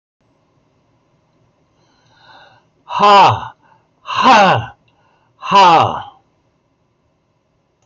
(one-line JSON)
{"exhalation_length": "7.9 s", "exhalation_amplitude": 28396, "exhalation_signal_mean_std_ratio": 0.38, "survey_phase": "beta (2021-08-13 to 2022-03-07)", "age": "65+", "gender": "Male", "wearing_mask": "No", "symptom_none": true, "symptom_onset": "12 days", "smoker_status": "Never smoked", "respiratory_condition_asthma": false, "respiratory_condition_other": false, "recruitment_source": "REACT", "submission_delay": "3 days", "covid_test_result": "Negative", "covid_test_method": "RT-qPCR", "influenza_a_test_result": "Negative", "influenza_b_test_result": "Negative"}